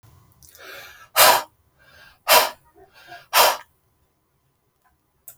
{"exhalation_length": "5.4 s", "exhalation_amplitude": 32768, "exhalation_signal_mean_std_ratio": 0.3, "survey_phase": "beta (2021-08-13 to 2022-03-07)", "age": "45-64", "gender": "Male", "wearing_mask": "No", "symptom_none": true, "smoker_status": "Ex-smoker", "respiratory_condition_asthma": false, "respiratory_condition_other": false, "recruitment_source": "REACT", "submission_delay": "1 day", "covid_test_result": "Negative", "covid_test_method": "RT-qPCR"}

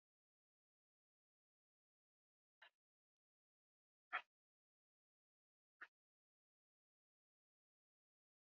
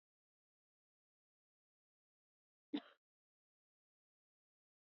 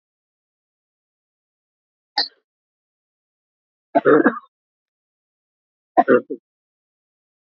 {"exhalation_length": "8.4 s", "exhalation_amplitude": 873, "exhalation_signal_mean_std_ratio": 0.08, "cough_length": "4.9 s", "cough_amplitude": 880, "cough_signal_mean_std_ratio": 0.1, "three_cough_length": "7.4 s", "three_cough_amplitude": 27315, "three_cough_signal_mean_std_ratio": 0.21, "survey_phase": "beta (2021-08-13 to 2022-03-07)", "age": "45-64", "gender": "Female", "wearing_mask": "No", "symptom_none": true, "smoker_status": "Current smoker (11 or more cigarettes per day)", "respiratory_condition_asthma": false, "respiratory_condition_other": true, "recruitment_source": "REACT", "submission_delay": "1 day", "covid_test_result": "Negative", "covid_test_method": "RT-qPCR", "influenza_a_test_result": "Negative", "influenza_b_test_result": "Negative"}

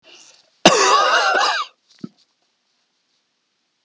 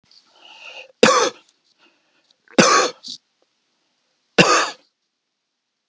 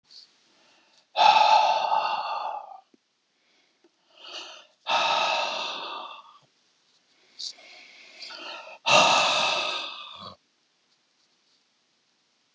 {"cough_length": "3.8 s", "cough_amplitude": 32768, "cough_signal_mean_std_ratio": 0.42, "three_cough_length": "5.9 s", "three_cough_amplitude": 32768, "three_cough_signal_mean_std_ratio": 0.31, "exhalation_length": "12.5 s", "exhalation_amplitude": 18637, "exhalation_signal_mean_std_ratio": 0.43, "survey_phase": "beta (2021-08-13 to 2022-03-07)", "age": "65+", "gender": "Male", "wearing_mask": "No", "symptom_none": true, "smoker_status": "Never smoked", "respiratory_condition_asthma": false, "respiratory_condition_other": false, "recruitment_source": "REACT", "submission_delay": "1 day", "covid_test_result": "Negative", "covid_test_method": "RT-qPCR", "influenza_a_test_result": "Negative", "influenza_b_test_result": "Negative"}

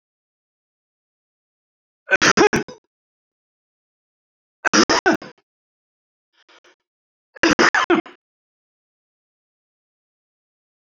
{"three_cough_length": "10.8 s", "three_cough_amplitude": 30569, "three_cough_signal_mean_std_ratio": 0.25, "survey_phase": "alpha (2021-03-01 to 2021-08-12)", "age": "65+", "gender": "Male", "wearing_mask": "No", "symptom_none": true, "smoker_status": "Ex-smoker", "respiratory_condition_asthma": false, "respiratory_condition_other": false, "recruitment_source": "REACT", "submission_delay": "8 days", "covid_test_result": "Negative", "covid_test_method": "RT-qPCR"}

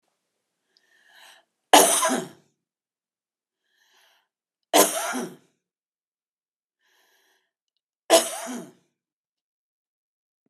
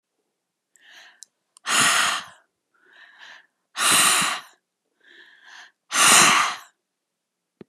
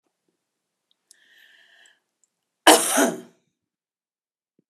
{"three_cough_length": "10.5 s", "three_cough_amplitude": 32767, "three_cough_signal_mean_std_ratio": 0.24, "exhalation_length": "7.7 s", "exhalation_amplitude": 31404, "exhalation_signal_mean_std_ratio": 0.39, "cough_length": "4.7 s", "cough_amplitude": 32767, "cough_signal_mean_std_ratio": 0.22, "survey_phase": "beta (2021-08-13 to 2022-03-07)", "age": "65+", "gender": "Female", "wearing_mask": "No", "symptom_cough_any": true, "symptom_runny_or_blocked_nose": true, "symptom_shortness_of_breath": true, "symptom_sore_throat": true, "symptom_fatigue": true, "symptom_headache": true, "symptom_change_to_sense_of_smell_or_taste": true, "symptom_other": true, "smoker_status": "Ex-smoker", "respiratory_condition_asthma": false, "respiratory_condition_other": false, "recruitment_source": "Test and Trace", "submission_delay": "2 days", "covid_test_result": "Positive", "covid_test_method": "RT-qPCR", "covid_ct_value": 29.5, "covid_ct_gene": "ORF1ab gene"}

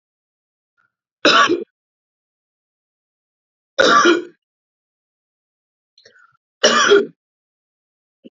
{"three_cough_length": "8.4 s", "three_cough_amplitude": 31526, "three_cough_signal_mean_std_ratio": 0.3, "survey_phase": "alpha (2021-03-01 to 2021-08-12)", "age": "45-64", "gender": "Female", "wearing_mask": "No", "symptom_none": true, "smoker_status": "Never smoked", "respiratory_condition_asthma": false, "respiratory_condition_other": false, "recruitment_source": "REACT", "submission_delay": "1 day", "covid_test_result": "Negative", "covid_test_method": "RT-qPCR"}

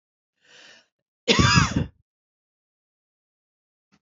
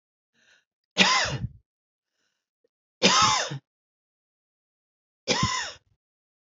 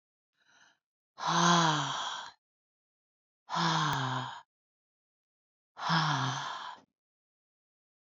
{"cough_length": "4.0 s", "cough_amplitude": 19549, "cough_signal_mean_std_ratio": 0.28, "three_cough_length": "6.5 s", "three_cough_amplitude": 24360, "three_cough_signal_mean_std_ratio": 0.35, "exhalation_length": "8.1 s", "exhalation_amplitude": 8158, "exhalation_signal_mean_std_ratio": 0.45, "survey_phase": "beta (2021-08-13 to 2022-03-07)", "age": "45-64", "gender": "Female", "wearing_mask": "No", "symptom_cough_any": true, "symptom_fatigue": true, "symptom_headache": true, "symptom_other": true, "smoker_status": "Never smoked", "respiratory_condition_asthma": false, "respiratory_condition_other": false, "recruitment_source": "Test and Trace", "submission_delay": "2 days", "covid_test_result": "Positive", "covid_test_method": "LFT"}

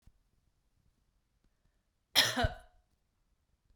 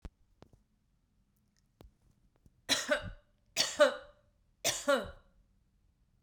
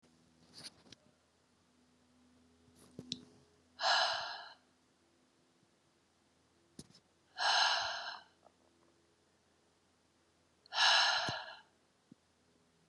{"cough_length": "3.8 s", "cough_amplitude": 11076, "cough_signal_mean_std_ratio": 0.23, "three_cough_length": "6.2 s", "three_cough_amplitude": 7966, "three_cough_signal_mean_std_ratio": 0.3, "exhalation_length": "12.9 s", "exhalation_amplitude": 4940, "exhalation_signal_mean_std_ratio": 0.32, "survey_phase": "beta (2021-08-13 to 2022-03-07)", "age": "45-64", "gender": "Female", "wearing_mask": "No", "symptom_runny_or_blocked_nose": true, "symptom_sore_throat": true, "symptom_fatigue": true, "symptom_headache": true, "smoker_status": "Ex-smoker", "respiratory_condition_asthma": false, "respiratory_condition_other": false, "recruitment_source": "Test and Trace", "submission_delay": "2 days", "covid_test_result": "Positive", "covid_test_method": "RT-qPCR", "covid_ct_value": 20.0, "covid_ct_gene": "ORF1ab gene", "covid_ct_mean": 21.1, "covid_viral_load": "120000 copies/ml", "covid_viral_load_category": "Low viral load (10K-1M copies/ml)"}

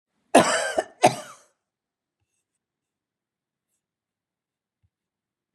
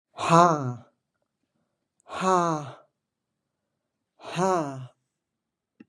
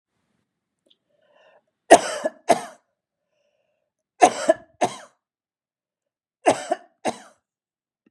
{"cough_length": "5.5 s", "cough_amplitude": 25925, "cough_signal_mean_std_ratio": 0.21, "exhalation_length": "5.9 s", "exhalation_amplitude": 23574, "exhalation_signal_mean_std_ratio": 0.33, "three_cough_length": "8.1 s", "three_cough_amplitude": 32768, "three_cough_signal_mean_std_ratio": 0.22, "survey_phase": "beta (2021-08-13 to 2022-03-07)", "age": "65+", "gender": "Female", "wearing_mask": "No", "symptom_none": true, "smoker_status": "Never smoked", "respiratory_condition_asthma": false, "respiratory_condition_other": false, "recruitment_source": "REACT", "submission_delay": "1 day", "covid_test_result": "Negative", "covid_test_method": "RT-qPCR", "influenza_a_test_result": "Negative", "influenza_b_test_result": "Negative"}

